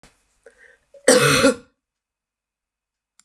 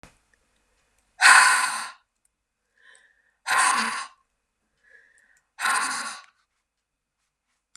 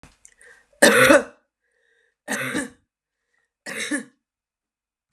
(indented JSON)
{
  "cough_length": "3.2 s",
  "cough_amplitude": 31687,
  "cough_signal_mean_std_ratio": 0.31,
  "exhalation_length": "7.8 s",
  "exhalation_amplitude": 28740,
  "exhalation_signal_mean_std_ratio": 0.32,
  "three_cough_length": "5.1 s",
  "three_cough_amplitude": 31763,
  "three_cough_signal_mean_std_ratio": 0.3,
  "survey_phase": "beta (2021-08-13 to 2022-03-07)",
  "age": "18-44",
  "gender": "Female",
  "wearing_mask": "No",
  "symptom_none": true,
  "smoker_status": "Ex-smoker",
  "respiratory_condition_asthma": false,
  "respiratory_condition_other": false,
  "recruitment_source": "REACT",
  "submission_delay": "1 day",
  "covid_test_result": "Negative",
  "covid_test_method": "RT-qPCR",
  "influenza_a_test_result": "Negative",
  "influenza_b_test_result": "Negative"
}